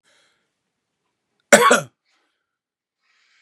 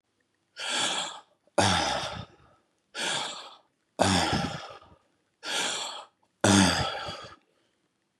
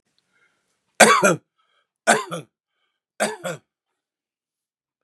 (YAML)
cough_length: 3.4 s
cough_amplitude: 32768
cough_signal_mean_std_ratio: 0.21
exhalation_length: 8.2 s
exhalation_amplitude: 17748
exhalation_signal_mean_std_ratio: 0.49
three_cough_length: 5.0 s
three_cough_amplitude: 32768
three_cough_signal_mean_std_ratio: 0.27
survey_phase: beta (2021-08-13 to 2022-03-07)
age: 45-64
gender: Male
wearing_mask: 'Yes'
symptom_cough_any: true
symptom_runny_or_blocked_nose: true
symptom_shortness_of_breath: true
symptom_fatigue: true
symptom_fever_high_temperature: true
symptom_headache: true
smoker_status: Ex-smoker
respiratory_condition_asthma: false
respiratory_condition_other: false
recruitment_source: Test and Trace
submission_delay: 0 days
covid_test_result: Positive
covid_test_method: LFT